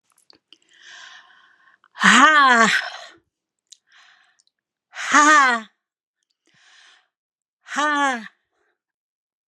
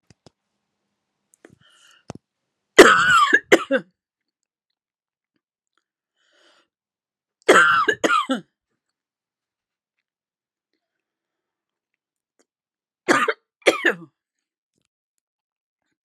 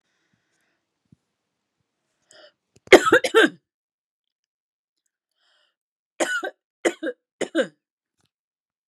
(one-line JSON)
{"exhalation_length": "9.5 s", "exhalation_amplitude": 32767, "exhalation_signal_mean_std_ratio": 0.35, "three_cough_length": "16.0 s", "three_cough_amplitude": 32768, "three_cough_signal_mean_std_ratio": 0.25, "cough_length": "8.9 s", "cough_amplitude": 32768, "cough_signal_mean_std_ratio": 0.21, "survey_phase": "beta (2021-08-13 to 2022-03-07)", "age": "65+", "gender": "Female", "wearing_mask": "No", "symptom_none": true, "smoker_status": "Ex-smoker", "respiratory_condition_asthma": false, "respiratory_condition_other": false, "recruitment_source": "REACT", "submission_delay": "0 days", "covid_test_result": "Negative", "covid_test_method": "RT-qPCR"}